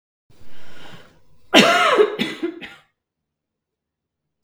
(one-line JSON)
{"cough_length": "4.4 s", "cough_amplitude": 32768, "cough_signal_mean_std_ratio": 0.42, "survey_phase": "beta (2021-08-13 to 2022-03-07)", "age": "18-44", "gender": "Female", "wearing_mask": "No", "symptom_none": true, "smoker_status": "Never smoked", "respiratory_condition_asthma": false, "respiratory_condition_other": false, "recruitment_source": "REACT", "submission_delay": "1 day", "covid_test_result": "Negative", "covid_test_method": "RT-qPCR", "influenza_a_test_result": "Unknown/Void", "influenza_b_test_result": "Unknown/Void"}